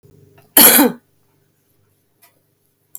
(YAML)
cough_length: 3.0 s
cough_amplitude: 32768
cough_signal_mean_std_ratio: 0.28
survey_phase: beta (2021-08-13 to 2022-03-07)
age: 65+
gender: Female
wearing_mask: 'No'
symptom_none: true
smoker_status: Current smoker (1 to 10 cigarettes per day)
respiratory_condition_asthma: false
respiratory_condition_other: false
recruitment_source: REACT
submission_delay: 4 days
covid_test_result: Negative
covid_test_method: RT-qPCR
influenza_a_test_result: Negative
influenza_b_test_result: Negative